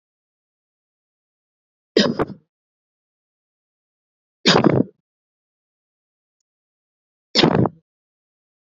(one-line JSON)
{"three_cough_length": "8.6 s", "three_cough_amplitude": 28810, "three_cough_signal_mean_std_ratio": 0.24, "survey_phase": "beta (2021-08-13 to 2022-03-07)", "age": "18-44", "gender": "Female", "wearing_mask": "No", "symptom_cough_any": true, "symptom_runny_or_blocked_nose": true, "symptom_sore_throat": true, "symptom_fatigue": true, "symptom_fever_high_temperature": true, "symptom_headache": true, "symptom_other": true, "symptom_onset": "3 days", "smoker_status": "Ex-smoker", "respiratory_condition_asthma": false, "respiratory_condition_other": false, "recruitment_source": "Test and Trace", "submission_delay": "2 days", "covid_test_result": "Positive", "covid_test_method": "ePCR"}